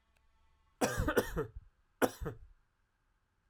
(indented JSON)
{
  "three_cough_length": "3.5 s",
  "three_cough_amplitude": 7031,
  "three_cough_signal_mean_std_ratio": 0.36,
  "survey_phase": "alpha (2021-03-01 to 2021-08-12)",
  "age": "18-44",
  "gender": "Male",
  "wearing_mask": "No",
  "symptom_cough_any": true,
  "symptom_shortness_of_breath": true,
  "symptom_fatigue": true,
  "symptom_fever_high_temperature": true,
  "symptom_headache": true,
  "symptom_onset": "3 days",
  "smoker_status": "Never smoked",
  "respiratory_condition_asthma": false,
  "respiratory_condition_other": false,
  "recruitment_source": "Test and Trace",
  "submission_delay": "2 days",
  "covid_test_result": "Positive",
  "covid_test_method": "RT-qPCR",
  "covid_ct_value": 17.2,
  "covid_ct_gene": "ORF1ab gene",
  "covid_ct_mean": 20.6,
  "covid_viral_load": "170000 copies/ml",
  "covid_viral_load_category": "Low viral load (10K-1M copies/ml)"
}